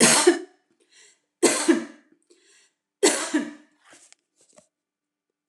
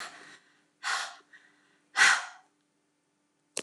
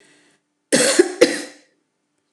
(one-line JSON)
{"three_cough_length": "5.5 s", "three_cough_amplitude": 23967, "three_cough_signal_mean_std_ratio": 0.35, "exhalation_length": "3.6 s", "exhalation_amplitude": 14692, "exhalation_signal_mean_std_ratio": 0.29, "cough_length": "2.3 s", "cough_amplitude": 29204, "cough_signal_mean_std_ratio": 0.36, "survey_phase": "beta (2021-08-13 to 2022-03-07)", "age": "45-64", "gender": "Female", "wearing_mask": "No", "symptom_none": true, "smoker_status": "Ex-smoker", "respiratory_condition_asthma": false, "respiratory_condition_other": false, "recruitment_source": "REACT", "submission_delay": "2 days", "covid_test_result": "Negative", "covid_test_method": "RT-qPCR"}